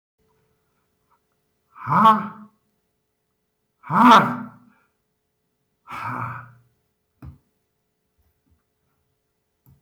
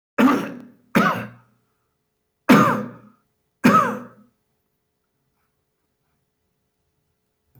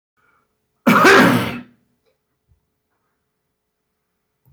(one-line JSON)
{"exhalation_length": "9.8 s", "exhalation_amplitude": 24983, "exhalation_signal_mean_std_ratio": 0.25, "three_cough_length": "7.6 s", "three_cough_amplitude": 25239, "three_cough_signal_mean_std_ratio": 0.32, "cough_length": "4.5 s", "cough_amplitude": 28052, "cough_signal_mean_std_ratio": 0.32, "survey_phase": "beta (2021-08-13 to 2022-03-07)", "age": "65+", "gender": "Male", "wearing_mask": "No", "symptom_none": true, "smoker_status": "Current smoker (1 to 10 cigarettes per day)", "respiratory_condition_asthma": false, "respiratory_condition_other": false, "recruitment_source": "REACT", "submission_delay": "5 days", "covid_test_result": "Negative", "covid_test_method": "RT-qPCR", "influenza_a_test_result": "Unknown/Void", "influenza_b_test_result": "Unknown/Void"}